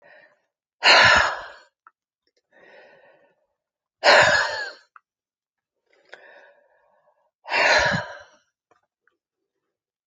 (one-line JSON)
{"exhalation_length": "10.1 s", "exhalation_amplitude": 27189, "exhalation_signal_mean_std_ratio": 0.32, "survey_phase": "alpha (2021-03-01 to 2021-08-12)", "age": "65+", "gender": "Female", "wearing_mask": "No", "symptom_cough_any": true, "smoker_status": "Ex-smoker", "respiratory_condition_asthma": true, "respiratory_condition_other": false, "recruitment_source": "REACT", "submission_delay": "3 days", "covid_test_result": "Negative", "covid_test_method": "RT-qPCR"}